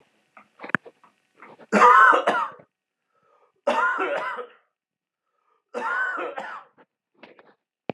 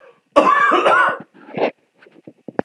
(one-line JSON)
{"three_cough_length": "7.9 s", "three_cough_amplitude": 27460, "three_cough_signal_mean_std_ratio": 0.36, "cough_length": "2.6 s", "cough_amplitude": 32768, "cough_signal_mean_std_ratio": 0.53, "survey_phase": "alpha (2021-03-01 to 2021-08-12)", "age": "18-44", "gender": "Male", "wearing_mask": "No", "symptom_shortness_of_breath": true, "symptom_fatigue": true, "smoker_status": "Ex-smoker", "respiratory_condition_asthma": false, "respiratory_condition_other": false, "recruitment_source": "Test and Trace", "submission_delay": "4 days", "covid_test_result": "Positive", "covid_test_method": "RT-qPCR"}